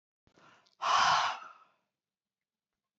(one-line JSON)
{"exhalation_length": "3.0 s", "exhalation_amplitude": 5659, "exhalation_signal_mean_std_ratio": 0.36, "survey_phase": "beta (2021-08-13 to 2022-03-07)", "age": "65+", "gender": "Female", "wearing_mask": "No", "symptom_none": true, "smoker_status": "Never smoked", "respiratory_condition_asthma": false, "respiratory_condition_other": false, "recruitment_source": "Test and Trace", "submission_delay": "2 days", "covid_test_result": "Positive", "covid_test_method": "RT-qPCR", "covid_ct_value": 33.1, "covid_ct_gene": "ORF1ab gene"}